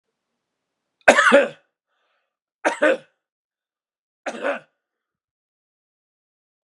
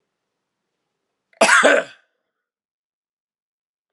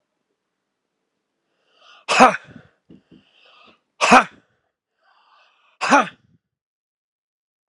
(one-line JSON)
{"three_cough_length": "6.7 s", "three_cough_amplitude": 32768, "three_cough_signal_mean_std_ratio": 0.25, "cough_length": "3.9 s", "cough_amplitude": 31950, "cough_signal_mean_std_ratio": 0.26, "exhalation_length": "7.7 s", "exhalation_amplitude": 32768, "exhalation_signal_mean_std_ratio": 0.22, "survey_phase": "beta (2021-08-13 to 2022-03-07)", "age": "45-64", "gender": "Male", "wearing_mask": "No", "symptom_cough_any": true, "symptom_shortness_of_breath": true, "symptom_sore_throat": true, "symptom_fatigue": true, "symptom_headache": true, "smoker_status": "Never smoked", "respiratory_condition_asthma": false, "respiratory_condition_other": false, "recruitment_source": "Test and Trace", "submission_delay": "2 days", "covid_test_result": "Positive", "covid_test_method": "RT-qPCR"}